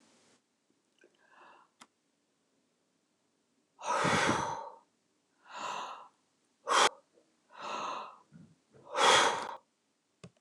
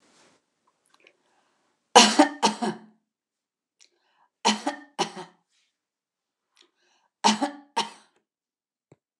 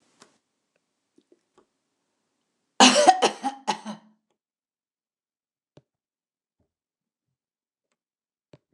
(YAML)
exhalation_length: 10.4 s
exhalation_amplitude: 7868
exhalation_signal_mean_std_ratio: 0.35
three_cough_length: 9.2 s
three_cough_amplitude: 29203
three_cough_signal_mean_std_ratio: 0.24
cough_length: 8.7 s
cough_amplitude: 28349
cough_signal_mean_std_ratio: 0.19
survey_phase: beta (2021-08-13 to 2022-03-07)
age: 65+
gender: Female
wearing_mask: 'No'
symptom_none: true
smoker_status: Ex-smoker
respiratory_condition_asthma: false
respiratory_condition_other: false
recruitment_source: REACT
submission_delay: 2 days
covid_test_result: Negative
covid_test_method: RT-qPCR
influenza_a_test_result: Negative
influenza_b_test_result: Negative